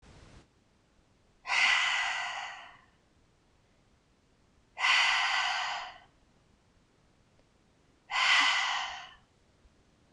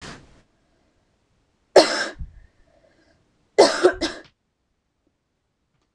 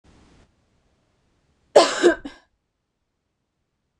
{"exhalation_length": "10.1 s", "exhalation_amplitude": 6980, "exhalation_signal_mean_std_ratio": 0.45, "three_cough_length": "5.9 s", "three_cough_amplitude": 26028, "three_cough_signal_mean_std_ratio": 0.24, "cough_length": "4.0 s", "cough_amplitude": 26028, "cough_signal_mean_std_ratio": 0.22, "survey_phase": "beta (2021-08-13 to 2022-03-07)", "age": "18-44", "gender": "Female", "wearing_mask": "No", "symptom_sore_throat": true, "smoker_status": "Ex-smoker", "respiratory_condition_asthma": false, "respiratory_condition_other": false, "recruitment_source": "REACT", "submission_delay": "3 days", "covid_test_result": "Negative", "covid_test_method": "RT-qPCR", "influenza_a_test_result": "Negative", "influenza_b_test_result": "Negative"}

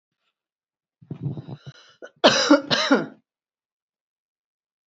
{"cough_length": "4.9 s", "cough_amplitude": 32676, "cough_signal_mean_std_ratio": 0.31, "survey_phase": "beta (2021-08-13 to 2022-03-07)", "age": "45-64", "gender": "Female", "wearing_mask": "No", "symptom_none": true, "smoker_status": "Never smoked", "respiratory_condition_asthma": true, "respiratory_condition_other": false, "recruitment_source": "REACT", "submission_delay": "1 day", "covid_test_result": "Negative", "covid_test_method": "RT-qPCR"}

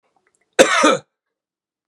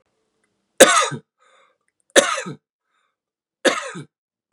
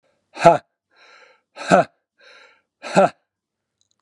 {"cough_length": "1.9 s", "cough_amplitude": 32768, "cough_signal_mean_std_ratio": 0.34, "three_cough_length": "4.5 s", "three_cough_amplitude": 32768, "three_cough_signal_mean_std_ratio": 0.27, "exhalation_length": "4.0 s", "exhalation_amplitude": 32767, "exhalation_signal_mean_std_ratio": 0.26, "survey_phase": "beta (2021-08-13 to 2022-03-07)", "age": "18-44", "gender": "Male", "wearing_mask": "No", "symptom_none": true, "smoker_status": "Never smoked", "respiratory_condition_asthma": false, "respiratory_condition_other": false, "recruitment_source": "REACT", "submission_delay": "1 day", "covid_test_result": "Negative", "covid_test_method": "RT-qPCR", "influenza_a_test_result": "Unknown/Void", "influenza_b_test_result": "Unknown/Void"}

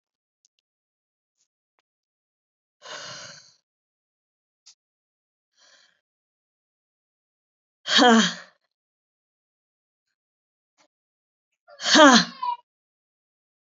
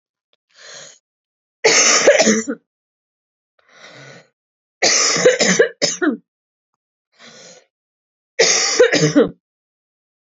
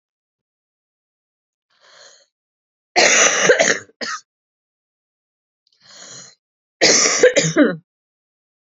{"exhalation_length": "13.7 s", "exhalation_amplitude": 29559, "exhalation_signal_mean_std_ratio": 0.2, "three_cough_length": "10.3 s", "three_cough_amplitude": 32005, "three_cough_signal_mean_std_ratio": 0.43, "cough_length": "8.6 s", "cough_amplitude": 32565, "cough_signal_mean_std_ratio": 0.36, "survey_phase": "beta (2021-08-13 to 2022-03-07)", "age": "18-44", "gender": "Female", "wearing_mask": "No", "symptom_cough_any": true, "symptom_runny_or_blocked_nose": true, "symptom_shortness_of_breath": true, "symptom_sore_throat": true, "symptom_fatigue": true, "symptom_headache": true, "symptom_onset": "3 days", "smoker_status": "Never smoked", "respiratory_condition_asthma": false, "respiratory_condition_other": false, "recruitment_source": "Test and Trace", "submission_delay": "1 day", "covid_test_result": "Positive", "covid_test_method": "RT-qPCR", "covid_ct_value": 24.1, "covid_ct_gene": "ORF1ab gene", "covid_ct_mean": 24.4, "covid_viral_load": "9900 copies/ml", "covid_viral_load_category": "Minimal viral load (< 10K copies/ml)"}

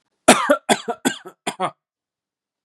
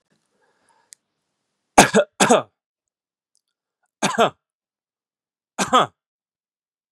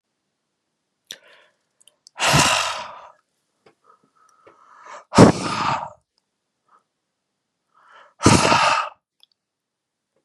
{"cough_length": "2.6 s", "cough_amplitude": 32768, "cough_signal_mean_std_ratio": 0.33, "three_cough_length": "6.9 s", "three_cough_amplitude": 32768, "three_cough_signal_mean_std_ratio": 0.25, "exhalation_length": "10.2 s", "exhalation_amplitude": 32768, "exhalation_signal_mean_std_ratio": 0.31, "survey_phase": "beta (2021-08-13 to 2022-03-07)", "age": "18-44", "gender": "Male", "wearing_mask": "No", "symptom_runny_or_blocked_nose": true, "symptom_diarrhoea": true, "smoker_status": "Never smoked", "respiratory_condition_asthma": false, "respiratory_condition_other": false, "recruitment_source": "Test and Trace", "submission_delay": "1 day", "covid_test_result": "Positive", "covid_test_method": "RT-qPCR"}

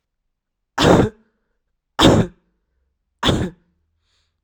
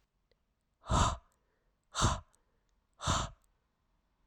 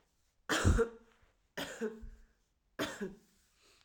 {"cough_length": "4.4 s", "cough_amplitude": 32768, "cough_signal_mean_std_ratio": 0.34, "exhalation_length": "4.3 s", "exhalation_amplitude": 5466, "exhalation_signal_mean_std_ratio": 0.33, "three_cough_length": "3.8 s", "three_cough_amplitude": 6430, "three_cough_signal_mean_std_ratio": 0.37, "survey_phase": "alpha (2021-03-01 to 2021-08-12)", "age": "18-44", "gender": "Female", "wearing_mask": "No", "symptom_fever_high_temperature": true, "symptom_headache": true, "symptom_change_to_sense_of_smell_or_taste": true, "symptom_loss_of_taste": true, "smoker_status": "Current smoker (1 to 10 cigarettes per day)", "respiratory_condition_asthma": false, "respiratory_condition_other": false, "recruitment_source": "Test and Trace", "submission_delay": "3 days", "covid_test_result": "Positive", "covid_test_method": "RT-qPCR"}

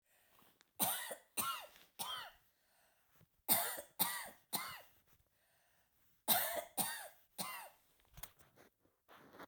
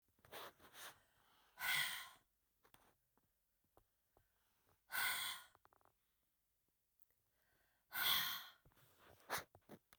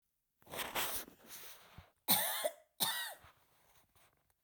{"three_cough_length": "9.5 s", "three_cough_amplitude": 5425, "three_cough_signal_mean_std_ratio": 0.39, "exhalation_length": "10.0 s", "exhalation_amplitude": 1890, "exhalation_signal_mean_std_ratio": 0.35, "cough_length": "4.4 s", "cough_amplitude": 6313, "cough_signal_mean_std_ratio": 0.43, "survey_phase": "beta (2021-08-13 to 2022-03-07)", "age": "45-64", "gender": "Female", "wearing_mask": "No", "symptom_cough_any": true, "symptom_runny_or_blocked_nose": true, "symptom_sore_throat": true, "symptom_headache": true, "symptom_change_to_sense_of_smell_or_taste": true, "smoker_status": "Never smoked", "respiratory_condition_asthma": false, "respiratory_condition_other": false, "recruitment_source": "Test and Trace", "submission_delay": "1 day", "covid_test_result": "Positive", "covid_test_method": "RT-qPCR", "covid_ct_value": 16.4, "covid_ct_gene": "ORF1ab gene", "covid_ct_mean": 17.0, "covid_viral_load": "2700000 copies/ml", "covid_viral_load_category": "High viral load (>1M copies/ml)"}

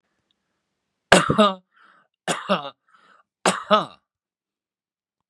{"three_cough_length": "5.3 s", "three_cough_amplitude": 32768, "three_cough_signal_mean_std_ratio": 0.29, "survey_phase": "beta (2021-08-13 to 2022-03-07)", "age": "65+", "gender": "Male", "wearing_mask": "No", "symptom_none": true, "smoker_status": "Ex-smoker", "respiratory_condition_asthma": false, "respiratory_condition_other": false, "recruitment_source": "REACT", "submission_delay": "1 day", "covid_test_result": "Negative", "covid_test_method": "RT-qPCR", "influenza_a_test_result": "Negative", "influenza_b_test_result": "Negative"}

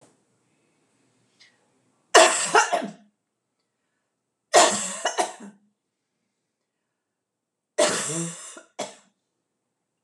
{"three_cough_length": "10.0 s", "three_cough_amplitude": 26027, "three_cough_signal_mean_std_ratio": 0.29, "survey_phase": "beta (2021-08-13 to 2022-03-07)", "age": "45-64", "gender": "Female", "wearing_mask": "No", "symptom_none": true, "smoker_status": "Ex-smoker", "respiratory_condition_asthma": false, "respiratory_condition_other": false, "recruitment_source": "REACT", "submission_delay": "1 day", "covid_test_result": "Negative", "covid_test_method": "RT-qPCR", "influenza_a_test_result": "Unknown/Void", "influenza_b_test_result": "Unknown/Void"}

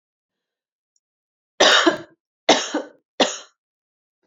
{"three_cough_length": "4.3 s", "three_cough_amplitude": 29117, "three_cough_signal_mean_std_ratio": 0.31, "survey_phase": "beta (2021-08-13 to 2022-03-07)", "age": "18-44", "gender": "Female", "wearing_mask": "No", "symptom_cough_any": true, "symptom_runny_or_blocked_nose": true, "symptom_diarrhoea": true, "symptom_fatigue": true, "symptom_headache": true, "symptom_change_to_sense_of_smell_or_taste": true, "symptom_loss_of_taste": true, "symptom_onset": "4 days", "smoker_status": "Never smoked", "respiratory_condition_asthma": false, "respiratory_condition_other": false, "recruitment_source": "Test and Trace", "submission_delay": "2 days", "covid_test_result": "Positive", "covid_test_method": "RT-qPCR"}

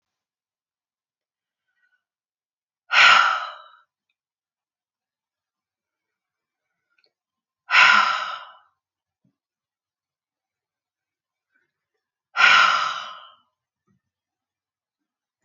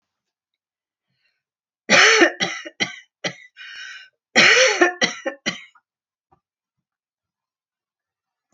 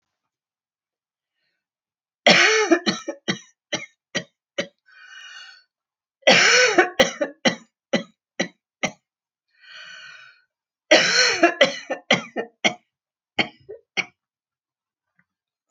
{"exhalation_length": "15.4 s", "exhalation_amplitude": 29971, "exhalation_signal_mean_std_ratio": 0.25, "cough_length": "8.5 s", "cough_amplitude": 28900, "cough_signal_mean_std_ratio": 0.33, "three_cough_length": "15.7 s", "three_cough_amplitude": 28991, "three_cough_signal_mean_std_ratio": 0.34, "survey_phase": "alpha (2021-03-01 to 2021-08-12)", "age": "65+", "gender": "Female", "wearing_mask": "No", "symptom_none": true, "smoker_status": "Never smoked", "respiratory_condition_asthma": false, "respiratory_condition_other": false, "recruitment_source": "REACT", "submission_delay": "2 days", "covid_test_result": "Negative", "covid_test_method": "RT-qPCR"}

